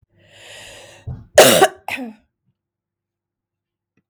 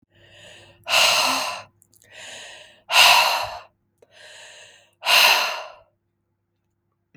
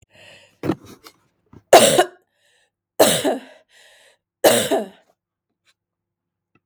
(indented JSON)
{
  "cough_length": "4.1 s",
  "cough_amplitude": 32768,
  "cough_signal_mean_std_ratio": 0.26,
  "exhalation_length": "7.2 s",
  "exhalation_amplitude": 32755,
  "exhalation_signal_mean_std_ratio": 0.41,
  "three_cough_length": "6.7 s",
  "three_cough_amplitude": 32768,
  "three_cough_signal_mean_std_ratio": 0.31,
  "survey_phase": "beta (2021-08-13 to 2022-03-07)",
  "age": "45-64",
  "gender": "Female",
  "wearing_mask": "No",
  "symptom_runny_or_blocked_nose": true,
  "symptom_fatigue": true,
  "symptom_fever_high_temperature": true,
  "symptom_headache": true,
  "symptom_onset": "3 days",
  "smoker_status": "Never smoked",
  "respiratory_condition_asthma": false,
  "respiratory_condition_other": false,
  "recruitment_source": "Test and Trace",
  "submission_delay": "1 day",
  "covid_test_result": "Positive",
  "covid_test_method": "RT-qPCR",
  "covid_ct_value": 18.0,
  "covid_ct_gene": "ORF1ab gene",
  "covid_ct_mean": 18.3,
  "covid_viral_load": "1000000 copies/ml",
  "covid_viral_load_category": "High viral load (>1M copies/ml)"
}